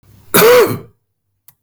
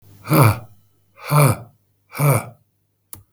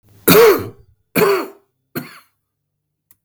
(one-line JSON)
{"cough_length": "1.6 s", "cough_amplitude": 32768, "cough_signal_mean_std_ratio": 0.48, "exhalation_length": "3.3 s", "exhalation_amplitude": 32766, "exhalation_signal_mean_std_ratio": 0.42, "three_cough_length": "3.2 s", "three_cough_amplitude": 32768, "three_cough_signal_mean_std_ratio": 0.38, "survey_phase": "beta (2021-08-13 to 2022-03-07)", "age": "45-64", "gender": "Male", "wearing_mask": "No", "symptom_cough_any": true, "symptom_runny_or_blocked_nose": true, "symptom_diarrhoea": true, "symptom_fatigue": true, "symptom_onset": "4 days", "smoker_status": "Ex-smoker", "respiratory_condition_asthma": false, "respiratory_condition_other": false, "recruitment_source": "Test and Trace", "submission_delay": "3 days", "covid_test_result": "Positive", "covid_test_method": "RT-qPCR", "covid_ct_value": 14.9, "covid_ct_gene": "ORF1ab gene", "covid_ct_mean": 15.2, "covid_viral_load": "10000000 copies/ml", "covid_viral_load_category": "High viral load (>1M copies/ml)"}